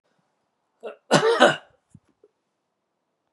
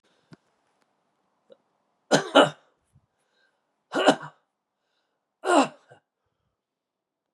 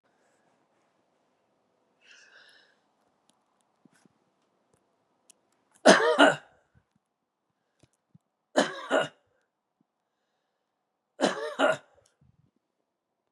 {"cough_length": "3.3 s", "cough_amplitude": 30642, "cough_signal_mean_std_ratio": 0.28, "exhalation_length": "7.3 s", "exhalation_amplitude": 27025, "exhalation_signal_mean_std_ratio": 0.23, "three_cough_length": "13.3 s", "three_cough_amplitude": 23544, "three_cough_signal_mean_std_ratio": 0.21, "survey_phase": "beta (2021-08-13 to 2022-03-07)", "age": "65+", "gender": "Male", "wearing_mask": "No", "symptom_cough_any": true, "symptom_runny_or_blocked_nose": true, "symptom_headache": true, "symptom_onset": "3 days", "smoker_status": "Never smoked", "respiratory_condition_asthma": false, "respiratory_condition_other": false, "recruitment_source": "Test and Trace", "submission_delay": "1 day", "covid_test_result": "Positive", "covid_test_method": "RT-qPCR", "covid_ct_value": 16.7, "covid_ct_gene": "ORF1ab gene", "covid_ct_mean": 18.0, "covid_viral_load": "1300000 copies/ml", "covid_viral_load_category": "High viral load (>1M copies/ml)"}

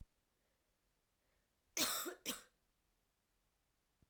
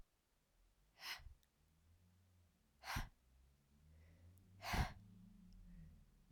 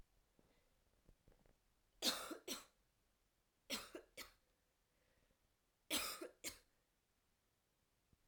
{"cough_length": "4.1 s", "cough_amplitude": 2267, "cough_signal_mean_std_ratio": 0.28, "exhalation_length": "6.3 s", "exhalation_amplitude": 1228, "exhalation_signal_mean_std_ratio": 0.36, "three_cough_length": "8.3 s", "three_cough_amplitude": 1977, "three_cough_signal_mean_std_ratio": 0.3, "survey_phase": "alpha (2021-03-01 to 2021-08-12)", "age": "18-44", "gender": "Female", "wearing_mask": "No", "symptom_shortness_of_breath": true, "symptom_fatigue": true, "symptom_change_to_sense_of_smell_or_taste": true, "symptom_loss_of_taste": true, "symptom_onset": "2 days", "smoker_status": "Never smoked", "respiratory_condition_asthma": false, "respiratory_condition_other": false, "recruitment_source": "Test and Trace", "submission_delay": "2 days", "covid_test_result": "Positive", "covid_test_method": "RT-qPCR", "covid_ct_value": 13.5, "covid_ct_gene": "ORF1ab gene", "covid_ct_mean": 13.9, "covid_viral_load": "27000000 copies/ml", "covid_viral_load_category": "High viral load (>1M copies/ml)"}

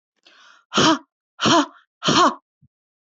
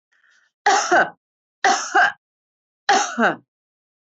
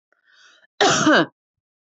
{"exhalation_length": "3.2 s", "exhalation_amplitude": 21679, "exhalation_signal_mean_std_ratio": 0.41, "three_cough_length": "4.1 s", "three_cough_amplitude": 24039, "three_cough_signal_mean_std_ratio": 0.43, "cough_length": "2.0 s", "cough_amplitude": 21458, "cough_signal_mean_std_ratio": 0.39, "survey_phase": "alpha (2021-03-01 to 2021-08-12)", "age": "45-64", "gender": "Female", "wearing_mask": "No", "symptom_none": true, "smoker_status": "Never smoked", "respiratory_condition_asthma": false, "respiratory_condition_other": false, "recruitment_source": "REACT", "submission_delay": "1 day", "covid_test_result": "Negative", "covid_test_method": "RT-qPCR"}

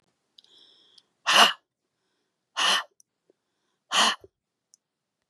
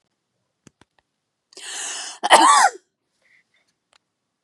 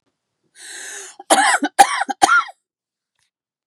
{"exhalation_length": "5.3 s", "exhalation_amplitude": 27618, "exhalation_signal_mean_std_ratio": 0.28, "cough_length": "4.4 s", "cough_amplitude": 32768, "cough_signal_mean_std_ratio": 0.29, "three_cough_length": "3.7 s", "three_cough_amplitude": 32768, "three_cough_signal_mean_std_ratio": 0.37, "survey_phase": "beta (2021-08-13 to 2022-03-07)", "age": "18-44", "gender": "Female", "wearing_mask": "No", "symptom_headache": true, "symptom_onset": "12 days", "smoker_status": "Ex-smoker", "respiratory_condition_asthma": true, "respiratory_condition_other": false, "recruitment_source": "REACT", "submission_delay": "2 days", "covid_test_result": "Negative", "covid_test_method": "RT-qPCR", "influenza_a_test_result": "Unknown/Void", "influenza_b_test_result": "Unknown/Void"}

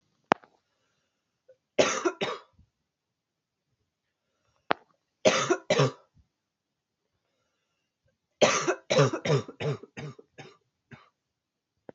{"three_cough_length": "11.9 s", "three_cough_amplitude": 27052, "three_cough_signal_mean_std_ratio": 0.3, "survey_phase": "beta (2021-08-13 to 2022-03-07)", "age": "18-44", "gender": "Female", "wearing_mask": "No", "symptom_cough_any": true, "symptom_runny_or_blocked_nose": true, "symptom_sore_throat": true, "symptom_fatigue": true, "symptom_change_to_sense_of_smell_or_taste": true, "symptom_onset": "2 days", "smoker_status": "Current smoker (11 or more cigarettes per day)", "respiratory_condition_asthma": false, "respiratory_condition_other": false, "recruitment_source": "Test and Trace", "submission_delay": "1 day", "covid_test_result": "Positive", "covid_test_method": "RT-qPCR", "covid_ct_value": 13.9, "covid_ct_gene": "ORF1ab gene"}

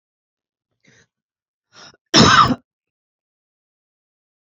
{"cough_length": "4.5 s", "cough_amplitude": 31174, "cough_signal_mean_std_ratio": 0.24, "survey_phase": "beta (2021-08-13 to 2022-03-07)", "age": "45-64", "gender": "Female", "wearing_mask": "No", "symptom_none": true, "symptom_onset": "4 days", "smoker_status": "Never smoked", "respiratory_condition_asthma": false, "respiratory_condition_other": false, "recruitment_source": "REACT", "submission_delay": "0 days", "covid_test_result": "Negative", "covid_test_method": "RT-qPCR", "influenza_a_test_result": "Negative", "influenza_b_test_result": "Negative"}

